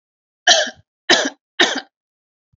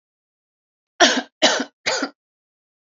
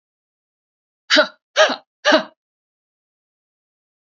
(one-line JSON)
{"cough_length": "2.6 s", "cough_amplitude": 32768, "cough_signal_mean_std_ratio": 0.36, "three_cough_length": "2.9 s", "three_cough_amplitude": 31158, "three_cough_signal_mean_std_ratio": 0.33, "exhalation_length": "4.2 s", "exhalation_amplitude": 28624, "exhalation_signal_mean_std_ratio": 0.27, "survey_phase": "alpha (2021-03-01 to 2021-08-12)", "age": "45-64", "gender": "Female", "wearing_mask": "No", "symptom_none": true, "smoker_status": "Never smoked", "respiratory_condition_asthma": false, "respiratory_condition_other": false, "recruitment_source": "REACT", "submission_delay": "1 day", "covid_test_result": "Negative", "covid_test_method": "RT-qPCR"}